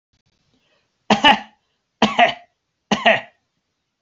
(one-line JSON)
{"three_cough_length": "4.0 s", "three_cough_amplitude": 31337, "three_cough_signal_mean_std_ratio": 0.32, "survey_phase": "beta (2021-08-13 to 2022-03-07)", "age": "65+", "gender": "Male", "wearing_mask": "No", "symptom_none": true, "smoker_status": "Ex-smoker", "respiratory_condition_asthma": false, "respiratory_condition_other": false, "recruitment_source": "REACT", "submission_delay": "1 day", "covid_test_result": "Negative", "covid_test_method": "RT-qPCR", "influenza_a_test_result": "Negative", "influenza_b_test_result": "Negative"}